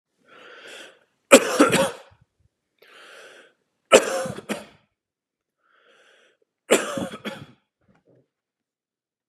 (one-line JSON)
{"three_cough_length": "9.3 s", "three_cough_amplitude": 32768, "three_cough_signal_mean_std_ratio": 0.25, "survey_phase": "beta (2021-08-13 to 2022-03-07)", "age": "18-44", "gender": "Male", "wearing_mask": "No", "symptom_cough_any": true, "symptom_runny_or_blocked_nose": true, "symptom_sore_throat": true, "symptom_onset": "3 days", "smoker_status": "Never smoked", "respiratory_condition_asthma": false, "respiratory_condition_other": false, "recruitment_source": "Test and Trace", "submission_delay": "2 days", "covid_test_result": "Positive", "covid_test_method": "RT-qPCR", "covid_ct_value": 29.0, "covid_ct_gene": "N gene", "covid_ct_mean": 29.0, "covid_viral_load": "300 copies/ml", "covid_viral_load_category": "Minimal viral load (< 10K copies/ml)"}